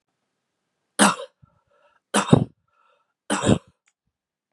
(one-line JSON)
{"three_cough_length": "4.5 s", "three_cough_amplitude": 31953, "three_cough_signal_mean_std_ratio": 0.27, "survey_phase": "beta (2021-08-13 to 2022-03-07)", "age": "18-44", "gender": "Male", "wearing_mask": "No", "symptom_cough_any": true, "symptom_runny_or_blocked_nose": true, "symptom_sore_throat": true, "symptom_onset": "4 days", "smoker_status": "Current smoker (1 to 10 cigarettes per day)", "respiratory_condition_asthma": false, "respiratory_condition_other": false, "recruitment_source": "Test and Trace", "submission_delay": "2 days", "covid_test_result": "Negative", "covid_test_method": "ePCR"}